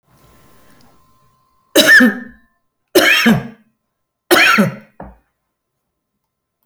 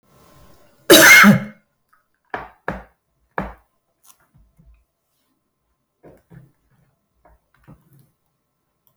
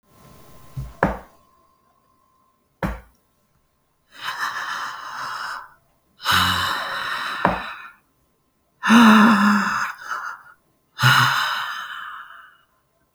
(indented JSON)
{
  "three_cough_length": "6.7 s",
  "three_cough_amplitude": 32768,
  "three_cough_signal_mean_std_ratio": 0.37,
  "cough_length": "9.0 s",
  "cough_amplitude": 32768,
  "cough_signal_mean_std_ratio": 0.22,
  "exhalation_length": "13.1 s",
  "exhalation_amplitude": 28699,
  "exhalation_signal_mean_std_ratio": 0.45,
  "survey_phase": "beta (2021-08-13 to 2022-03-07)",
  "age": "65+",
  "gender": "Female",
  "wearing_mask": "No",
  "symptom_sore_throat": true,
  "symptom_fatigue": true,
  "smoker_status": "Ex-smoker",
  "respiratory_condition_asthma": false,
  "respiratory_condition_other": false,
  "recruitment_source": "REACT",
  "submission_delay": "5 days",
  "covid_test_result": "Negative",
  "covid_test_method": "RT-qPCR"
}